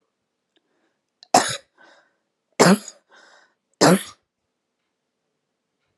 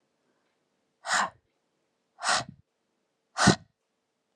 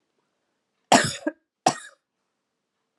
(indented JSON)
{
  "three_cough_length": "6.0 s",
  "three_cough_amplitude": 32140,
  "three_cough_signal_mean_std_ratio": 0.24,
  "exhalation_length": "4.4 s",
  "exhalation_amplitude": 17902,
  "exhalation_signal_mean_std_ratio": 0.27,
  "cough_length": "3.0 s",
  "cough_amplitude": 26752,
  "cough_signal_mean_std_ratio": 0.23,
  "survey_phase": "alpha (2021-03-01 to 2021-08-12)",
  "age": "18-44",
  "gender": "Female",
  "wearing_mask": "No",
  "symptom_shortness_of_breath": true,
  "symptom_fatigue": true,
  "symptom_headache": true,
  "symptom_onset": "4 days",
  "smoker_status": "Never smoked",
  "respiratory_condition_asthma": true,
  "respiratory_condition_other": false,
  "recruitment_source": "Test and Trace",
  "submission_delay": "3 days",
  "covid_test_result": "Positive",
  "covid_test_method": "RT-qPCR"
}